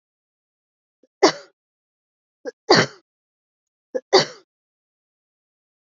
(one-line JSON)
{"three_cough_length": "5.9 s", "three_cough_amplitude": 29567, "three_cough_signal_mean_std_ratio": 0.2, "survey_phase": "beta (2021-08-13 to 2022-03-07)", "age": "45-64", "gender": "Female", "wearing_mask": "No", "symptom_none": true, "smoker_status": "Never smoked", "respiratory_condition_asthma": false, "respiratory_condition_other": false, "recruitment_source": "REACT", "submission_delay": "2 days", "covid_test_result": "Negative", "covid_test_method": "RT-qPCR", "influenza_a_test_result": "Unknown/Void", "influenza_b_test_result": "Unknown/Void"}